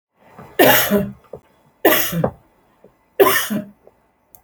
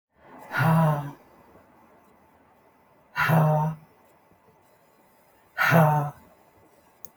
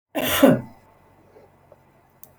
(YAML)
three_cough_length: 4.4 s
three_cough_amplitude: 32768
three_cough_signal_mean_std_ratio: 0.43
exhalation_length: 7.2 s
exhalation_amplitude: 17778
exhalation_signal_mean_std_ratio: 0.42
cough_length: 2.4 s
cough_amplitude: 27487
cough_signal_mean_std_ratio: 0.32
survey_phase: beta (2021-08-13 to 2022-03-07)
age: 45-64
gender: Female
wearing_mask: 'Yes'
symptom_runny_or_blocked_nose: true
symptom_abdominal_pain: true
symptom_fatigue: true
symptom_headache: true
symptom_onset: 11 days
smoker_status: Current smoker (e-cigarettes or vapes only)
respiratory_condition_asthma: false
respiratory_condition_other: false
recruitment_source: REACT
submission_delay: 1 day
covid_test_result: Negative
covid_test_method: RT-qPCR